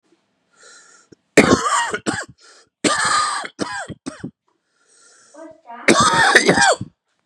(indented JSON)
{
  "three_cough_length": "7.3 s",
  "three_cough_amplitude": 32768,
  "three_cough_signal_mean_std_ratio": 0.46,
  "survey_phase": "beta (2021-08-13 to 2022-03-07)",
  "age": "18-44",
  "gender": "Male",
  "wearing_mask": "No",
  "symptom_cough_any": true,
  "symptom_runny_or_blocked_nose": true,
  "symptom_shortness_of_breath": true,
  "symptom_fatigue": true,
  "symptom_headache": true,
  "symptom_change_to_sense_of_smell_or_taste": true,
  "symptom_loss_of_taste": true,
  "smoker_status": "Ex-smoker",
  "respiratory_condition_asthma": false,
  "respiratory_condition_other": false,
  "recruitment_source": "Test and Trace",
  "submission_delay": "2 days",
  "covid_test_result": "Positive",
  "covid_test_method": "LFT"
}